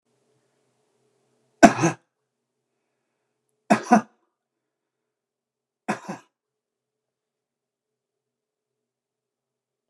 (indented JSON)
{
  "three_cough_length": "9.9 s",
  "three_cough_amplitude": 29204,
  "three_cough_signal_mean_std_ratio": 0.15,
  "survey_phase": "beta (2021-08-13 to 2022-03-07)",
  "age": "45-64",
  "gender": "Male",
  "wearing_mask": "No",
  "symptom_none": true,
  "smoker_status": "Never smoked",
  "respiratory_condition_asthma": false,
  "respiratory_condition_other": false,
  "recruitment_source": "REACT",
  "submission_delay": "2 days",
  "covid_test_result": "Negative",
  "covid_test_method": "RT-qPCR"
}